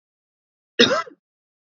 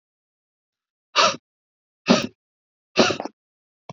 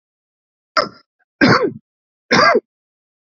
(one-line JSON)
{"cough_length": "1.8 s", "cough_amplitude": 28127, "cough_signal_mean_std_ratio": 0.26, "exhalation_length": "3.9 s", "exhalation_amplitude": 26246, "exhalation_signal_mean_std_ratio": 0.28, "three_cough_length": "3.2 s", "three_cough_amplitude": 28570, "three_cough_signal_mean_std_ratio": 0.37, "survey_phase": "beta (2021-08-13 to 2022-03-07)", "age": "45-64", "gender": "Male", "wearing_mask": "No", "symptom_runny_or_blocked_nose": true, "symptom_headache": true, "symptom_onset": "12 days", "smoker_status": "Ex-smoker", "respiratory_condition_asthma": false, "respiratory_condition_other": false, "recruitment_source": "REACT", "submission_delay": "0 days", "covid_test_result": "Negative", "covid_test_method": "RT-qPCR", "influenza_a_test_result": "Negative", "influenza_b_test_result": "Negative"}